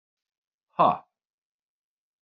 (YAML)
exhalation_length: 2.2 s
exhalation_amplitude: 14808
exhalation_signal_mean_std_ratio: 0.21
survey_phase: beta (2021-08-13 to 2022-03-07)
age: 45-64
gender: Male
wearing_mask: 'No'
symptom_none: true
smoker_status: Ex-smoker
respiratory_condition_asthma: false
respiratory_condition_other: false
recruitment_source: REACT
submission_delay: 3 days
covid_test_result: Negative
covid_test_method: RT-qPCR